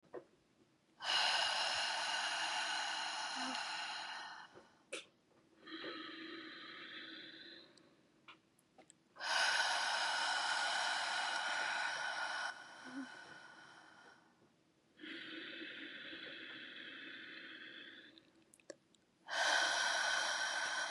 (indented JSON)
{
  "exhalation_length": "20.9 s",
  "exhalation_amplitude": 2661,
  "exhalation_signal_mean_std_ratio": 0.68,
  "survey_phase": "beta (2021-08-13 to 2022-03-07)",
  "age": "18-44",
  "gender": "Female",
  "wearing_mask": "No",
  "symptom_cough_any": true,
  "symptom_runny_or_blocked_nose": true,
  "symptom_shortness_of_breath": true,
  "symptom_sore_throat": true,
  "symptom_fatigue": true,
  "symptom_onset": "4 days",
  "smoker_status": "Never smoked",
  "respiratory_condition_asthma": false,
  "respiratory_condition_other": false,
  "recruitment_source": "Test and Trace",
  "submission_delay": "2 days",
  "covid_test_result": "Positive",
  "covid_test_method": "RT-qPCR",
  "covid_ct_value": 17.1,
  "covid_ct_gene": "ORF1ab gene",
  "covid_ct_mean": 17.4,
  "covid_viral_load": "1900000 copies/ml",
  "covid_viral_load_category": "High viral load (>1M copies/ml)"
}